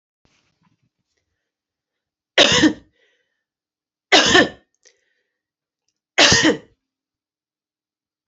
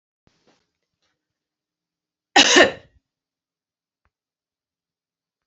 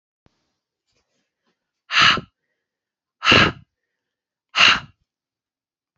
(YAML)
three_cough_length: 8.3 s
three_cough_amplitude: 32433
three_cough_signal_mean_std_ratio: 0.28
cough_length: 5.5 s
cough_amplitude: 31531
cough_signal_mean_std_ratio: 0.19
exhalation_length: 6.0 s
exhalation_amplitude: 32319
exhalation_signal_mean_std_ratio: 0.28
survey_phase: beta (2021-08-13 to 2022-03-07)
age: 45-64
gender: Female
wearing_mask: 'No'
symptom_runny_or_blocked_nose: true
symptom_fatigue: true
symptom_onset: 5 days
smoker_status: Never smoked
respiratory_condition_asthma: false
respiratory_condition_other: false
recruitment_source: REACT
submission_delay: 4 days
covid_test_result: Negative
covid_test_method: RT-qPCR